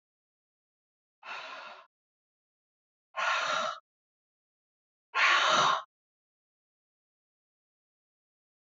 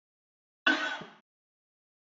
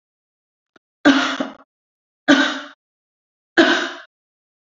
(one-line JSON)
{"exhalation_length": "8.6 s", "exhalation_amplitude": 8030, "exhalation_signal_mean_std_ratio": 0.32, "cough_length": "2.1 s", "cough_amplitude": 10093, "cough_signal_mean_std_ratio": 0.28, "three_cough_length": "4.7 s", "three_cough_amplitude": 31625, "three_cough_signal_mean_std_ratio": 0.34, "survey_phase": "beta (2021-08-13 to 2022-03-07)", "age": "65+", "gender": "Female", "wearing_mask": "No", "symptom_cough_any": true, "symptom_runny_or_blocked_nose": true, "symptom_other": true, "symptom_onset": "2 days", "smoker_status": "Never smoked", "respiratory_condition_asthma": false, "respiratory_condition_other": false, "recruitment_source": "Test and Trace", "submission_delay": "1 day", "covid_test_result": "Positive", "covid_test_method": "RT-qPCR", "covid_ct_value": 18.2, "covid_ct_gene": "ORF1ab gene", "covid_ct_mean": 18.7, "covid_viral_load": "750000 copies/ml", "covid_viral_load_category": "Low viral load (10K-1M copies/ml)"}